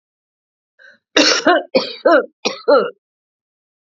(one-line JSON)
{"three_cough_length": "3.9 s", "three_cough_amplitude": 32768, "three_cough_signal_mean_std_ratio": 0.42, "survey_phase": "alpha (2021-03-01 to 2021-08-12)", "age": "65+", "gender": "Female", "wearing_mask": "No", "symptom_cough_any": true, "symptom_onset": "5 days", "smoker_status": "Never smoked", "respiratory_condition_asthma": true, "respiratory_condition_other": false, "recruitment_source": "Test and Trace", "submission_delay": "1 day", "covid_test_result": "Positive", "covid_test_method": "RT-qPCR"}